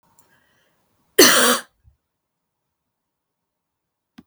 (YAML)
cough_length: 4.3 s
cough_amplitude: 32768
cough_signal_mean_std_ratio: 0.24
survey_phase: beta (2021-08-13 to 2022-03-07)
age: 18-44
gender: Female
wearing_mask: 'No'
symptom_cough_any: true
symptom_shortness_of_breath: true
symptom_fatigue: true
symptom_fever_high_temperature: true
symptom_headache: true
symptom_other: true
symptom_onset: 2 days
smoker_status: Never smoked
respiratory_condition_asthma: true
respiratory_condition_other: false
recruitment_source: Test and Trace
submission_delay: 2 days
covid_test_result: Positive
covid_test_method: ePCR